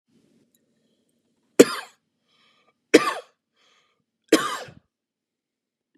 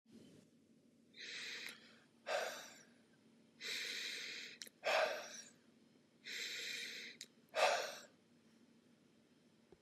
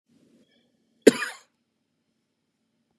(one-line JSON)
{"three_cough_length": "6.0 s", "three_cough_amplitude": 32768, "three_cough_signal_mean_std_ratio": 0.18, "exhalation_length": "9.8 s", "exhalation_amplitude": 3327, "exhalation_signal_mean_std_ratio": 0.47, "cough_length": "3.0 s", "cough_amplitude": 31570, "cough_signal_mean_std_ratio": 0.13, "survey_phase": "beta (2021-08-13 to 2022-03-07)", "age": "18-44", "gender": "Male", "wearing_mask": "No", "symptom_none": true, "smoker_status": "Never smoked", "respiratory_condition_asthma": false, "respiratory_condition_other": false, "recruitment_source": "REACT", "submission_delay": "3 days", "covid_test_result": "Negative", "covid_test_method": "RT-qPCR", "influenza_a_test_result": "Negative", "influenza_b_test_result": "Negative"}